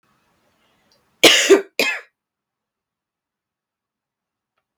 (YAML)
cough_length: 4.8 s
cough_amplitude: 32768
cough_signal_mean_std_ratio: 0.24
survey_phase: beta (2021-08-13 to 2022-03-07)
age: 18-44
gender: Female
wearing_mask: 'No'
symptom_cough_any: true
symptom_runny_or_blocked_nose: true
symptom_shortness_of_breath: true
symptom_fatigue: true
symptom_headache: true
symptom_change_to_sense_of_smell_or_taste: true
symptom_loss_of_taste: true
symptom_onset: 3 days
smoker_status: Never smoked
respiratory_condition_asthma: false
respiratory_condition_other: false
recruitment_source: Test and Trace
submission_delay: 1 day
covid_test_result: Positive
covid_test_method: ePCR